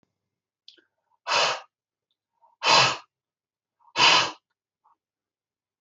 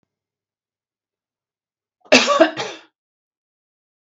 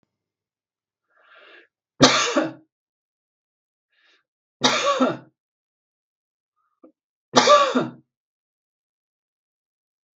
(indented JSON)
{
  "exhalation_length": "5.8 s",
  "exhalation_amplitude": 18251,
  "exhalation_signal_mean_std_ratio": 0.31,
  "cough_length": "4.0 s",
  "cough_amplitude": 32768,
  "cough_signal_mean_std_ratio": 0.24,
  "three_cough_length": "10.2 s",
  "three_cough_amplitude": 32768,
  "three_cough_signal_mean_std_ratio": 0.28,
  "survey_phase": "beta (2021-08-13 to 2022-03-07)",
  "age": "45-64",
  "gender": "Female",
  "wearing_mask": "No",
  "symptom_none": true,
  "smoker_status": "Never smoked",
  "respiratory_condition_asthma": false,
  "respiratory_condition_other": false,
  "recruitment_source": "REACT",
  "submission_delay": "5 days",
  "covid_test_result": "Negative",
  "covid_test_method": "RT-qPCR"
}